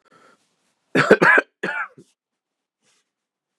{
  "cough_length": "3.6 s",
  "cough_amplitude": 32768,
  "cough_signal_mean_std_ratio": 0.29,
  "survey_phase": "beta (2021-08-13 to 2022-03-07)",
  "age": "45-64",
  "gender": "Male",
  "wearing_mask": "No",
  "symptom_cough_any": true,
  "symptom_sore_throat": true,
  "symptom_fatigue": true,
  "smoker_status": "Ex-smoker",
  "respiratory_condition_asthma": false,
  "respiratory_condition_other": false,
  "recruitment_source": "Test and Trace",
  "submission_delay": "1 day",
  "covid_test_result": "Positive",
  "covid_test_method": "LFT"
}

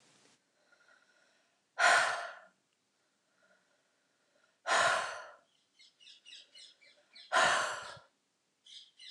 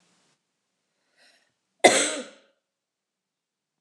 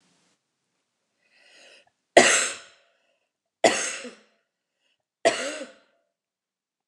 {
  "exhalation_length": "9.1 s",
  "exhalation_amplitude": 6413,
  "exhalation_signal_mean_std_ratio": 0.33,
  "cough_length": "3.8 s",
  "cough_amplitude": 28614,
  "cough_signal_mean_std_ratio": 0.2,
  "three_cough_length": "6.9 s",
  "three_cough_amplitude": 29204,
  "three_cough_signal_mean_std_ratio": 0.25,
  "survey_phase": "beta (2021-08-13 to 2022-03-07)",
  "age": "45-64",
  "gender": "Female",
  "wearing_mask": "No",
  "symptom_cough_any": true,
  "symptom_runny_or_blocked_nose": true,
  "symptom_headache": true,
  "smoker_status": "Ex-smoker",
  "respiratory_condition_asthma": false,
  "respiratory_condition_other": false,
  "recruitment_source": "Test and Trace",
  "submission_delay": "1 day",
  "covid_test_result": "Positive",
  "covid_test_method": "LFT"
}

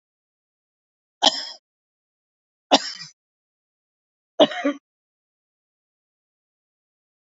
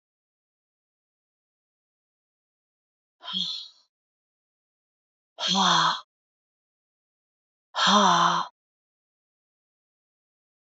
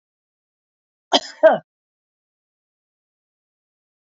{
  "three_cough_length": "7.3 s",
  "three_cough_amplitude": 27736,
  "three_cough_signal_mean_std_ratio": 0.19,
  "exhalation_length": "10.7 s",
  "exhalation_amplitude": 13789,
  "exhalation_signal_mean_std_ratio": 0.29,
  "cough_length": "4.1 s",
  "cough_amplitude": 29292,
  "cough_signal_mean_std_ratio": 0.17,
  "survey_phase": "beta (2021-08-13 to 2022-03-07)",
  "age": "45-64",
  "gender": "Female",
  "wearing_mask": "No",
  "symptom_runny_or_blocked_nose": true,
  "symptom_fatigue": true,
  "symptom_change_to_sense_of_smell_or_taste": true,
  "smoker_status": "Never smoked",
  "respiratory_condition_asthma": false,
  "respiratory_condition_other": false,
  "recruitment_source": "Test and Trace",
  "submission_delay": "2 days",
  "covid_test_result": "Positive",
  "covid_test_method": "RT-qPCR",
  "covid_ct_value": 19.6,
  "covid_ct_gene": "ORF1ab gene"
}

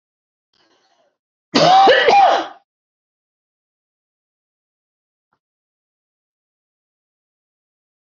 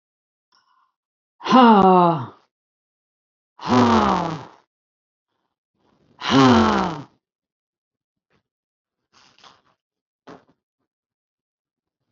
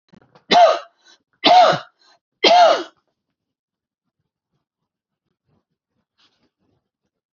{
  "cough_length": "8.1 s",
  "cough_amplitude": 29893,
  "cough_signal_mean_std_ratio": 0.28,
  "exhalation_length": "12.1 s",
  "exhalation_amplitude": 26816,
  "exhalation_signal_mean_std_ratio": 0.31,
  "three_cough_length": "7.3 s",
  "three_cough_amplitude": 32056,
  "three_cough_signal_mean_std_ratio": 0.31,
  "survey_phase": "alpha (2021-03-01 to 2021-08-12)",
  "age": "45-64",
  "gender": "Female",
  "wearing_mask": "No",
  "symptom_none": true,
  "smoker_status": "Ex-smoker",
  "respiratory_condition_asthma": false,
  "respiratory_condition_other": false,
  "recruitment_source": "REACT",
  "submission_delay": "1 day",
  "covid_test_result": "Negative",
  "covid_test_method": "RT-qPCR"
}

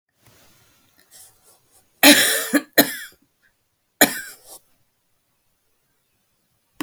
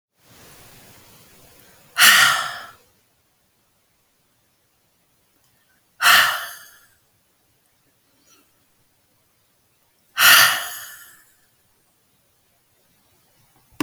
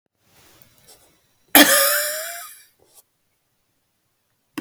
{
  "three_cough_length": "6.8 s",
  "three_cough_amplitude": 32768,
  "three_cough_signal_mean_std_ratio": 0.25,
  "exhalation_length": "13.8 s",
  "exhalation_amplitude": 32768,
  "exhalation_signal_mean_std_ratio": 0.26,
  "cough_length": "4.6 s",
  "cough_amplitude": 32768,
  "cough_signal_mean_std_ratio": 0.28,
  "survey_phase": "alpha (2021-03-01 to 2021-08-12)",
  "age": "45-64",
  "gender": "Female",
  "wearing_mask": "No",
  "symptom_cough_any": true,
  "symptom_fatigue": true,
  "symptom_headache": true,
  "symptom_change_to_sense_of_smell_or_taste": true,
  "smoker_status": "Never smoked",
  "respiratory_condition_asthma": false,
  "respiratory_condition_other": false,
  "recruitment_source": "REACT",
  "submission_delay": "2 days",
  "covid_test_result": "Negative",
  "covid_test_method": "RT-qPCR"
}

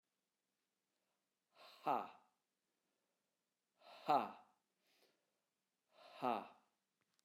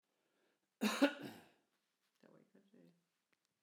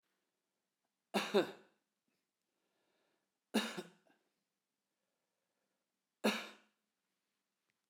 {
  "exhalation_length": "7.2 s",
  "exhalation_amplitude": 2053,
  "exhalation_signal_mean_std_ratio": 0.23,
  "cough_length": "3.6 s",
  "cough_amplitude": 3332,
  "cough_signal_mean_std_ratio": 0.23,
  "three_cough_length": "7.9 s",
  "three_cough_amplitude": 3118,
  "three_cough_signal_mean_std_ratio": 0.22,
  "survey_phase": "alpha (2021-03-01 to 2021-08-12)",
  "age": "45-64",
  "gender": "Male",
  "wearing_mask": "No",
  "symptom_none": true,
  "smoker_status": "Never smoked",
  "respiratory_condition_asthma": false,
  "respiratory_condition_other": false,
  "recruitment_source": "REACT",
  "submission_delay": "2 days",
  "covid_test_result": "Negative",
  "covid_test_method": "RT-qPCR"
}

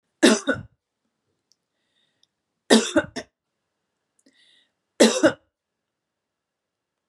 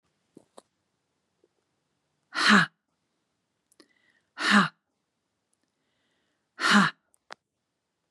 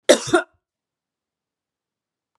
{
  "three_cough_length": "7.1 s",
  "three_cough_amplitude": 31966,
  "three_cough_signal_mean_std_ratio": 0.25,
  "exhalation_length": "8.1 s",
  "exhalation_amplitude": 17801,
  "exhalation_signal_mean_std_ratio": 0.25,
  "cough_length": "2.4 s",
  "cough_amplitude": 32768,
  "cough_signal_mean_std_ratio": 0.22,
  "survey_phase": "beta (2021-08-13 to 2022-03-07)",
  "age": "45-64",
  "gender": "Female",
  "wearing_mask": "No",
  "symptom_none": true,
  "symptom_onset": "7 days",
  "smoker_status": "Never smoked",
  "respiratory_condition_asthma": false,
  "respiratory_condition_other": false,
  "recruitment_source": "REACT",
  "submission_delay": "3 days",
  "covid_test_result": "Negative",
  "covid_test_method": "RT-qPCR",
  "influenza_a_test_result": "Negative",
  "influenza_b_test_result": "Negative"
}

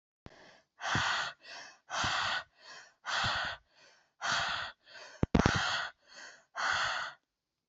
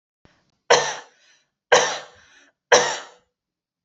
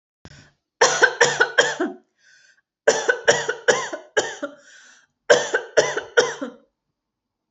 {
  "exhalation_length": "7.7 s",
  "exhalation_amplitude": 15497,
  "exhalation_signal_mean_std_ratio": 0.54,
  "three_cough_length": "3.8 s",
  "three_cough_amplitude": 29398,
  "three_cough_signal_mean_std_ratio": 0.31,
  "cough_length": "7.5 s",
  "cough_amplitude": 29048,
  "cough_signal_mean_std_ratio": 0.42,
  "survey_phase": "beta (2021-08-13 to 2022-03-07)",
  "age": "18-44",
  "gender": "Female",
  "wearing_mask": "No",
  "symptom_none": true,
  "smoker_status": "Never smoked",
  "respiratory_condition_asthma": false,
  "respiratory_condition_other": false,
  "recruitment_source": "REACT",
  "submission_delay": "1 day",
  "covid_test_result": "Negative",
  "covid_test_method": "RT-qPCR"
}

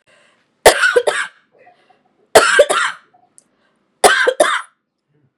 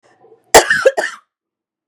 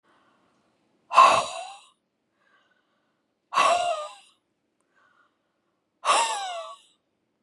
{
  "three_cough_length": "5.4 s",
  "three_cough_amplitude": 32768,
  "three_cough_signal_mean_std_ratio": 0.4,
  "cough_length": "1.9 s",
  "cough_amplitude": 32768,
  "cough_signal_mean_std_ratio": 0.34,
  "exhalation_length": "7.4 s",
  "exhalation_amplitude": 23717,
  "exhalation_signal_mean_std_ratio": 0.32,
  "survey_phase": "beta (2021-08-13 to 2022-03-07)",
  "age": "18-44",
  "gender": "Female",
  "wearing_mask": "No",
  "symptom_none": true,
  "symptom_onset": "8 days",
  "smoker_status": "Never smoked",
  "respiratory_condition_asthma": false,
  "respiratory_condition_other": false,
  "recruitment_source": "REACT",
  "submission_delay": "1 day",
  "covid_test_result": "Negative",
  "covid_test_method": "RT-qPCR",
  "influenza_a_test_result": "Negative",
  "influenza_b_test_result": "Negative"
}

